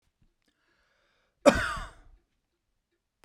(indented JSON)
{
  "cough_length": "3.2 s",
  "cough_amplitude": 21525,
  "cough_signal_mean_std_ratio": 0.2,
  "survey_phase": "beta (2021-08-13 to 2022-03-07)",
  "age": "65+",
  "gender": "Male",
  "wearing_mask": "No",
  "symptom_none": true,
  "smoker_status": "Never smoked",
  "respiratory_condition_asthma": false,
  "respiratory_condition_other": false,
  "recruitment_source": "REACT",
  "submission_delay": "2 days",
  "covid_test_result": "Negative",
  "covid_test_method": "RT-qPCR"
}